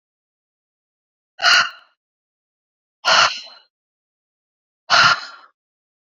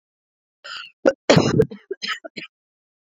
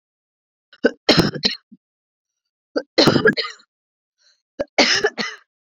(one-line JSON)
{"exhalation_length": "6.1 s", "exhalation_amplitude": 29800, "exhalation_signal_mean_std_ratio": 0.3, "cough_length": "3.1 s", "cough_amplitude": 27496, "cough_signal_mean_std_ratio": 0.33, "three_cough_length": "5.7 s", "three_cough_amplitude": 31907, "three_cough_signal_mean_std_ratio": 0.36, "survey_phase": "beta (2021-08-13 to 2022-03-07)", "age": "18-44", "gender": "Female", "wearing_mask": "No", "symptom_cough_any": true, "symptom_runny_or_blocked_nose": true, "symptom_headache": true, "symptom_other": true, "smoker_status": "Ex-smoker", "respiratory_condition_asthma": false, "respiratory_condition_other": false, "recruitment_source": "Test and Trace", "submission_delay": "3 days", "covid_test_result": "Positive", "covid_test_method": "RT-qPCR"}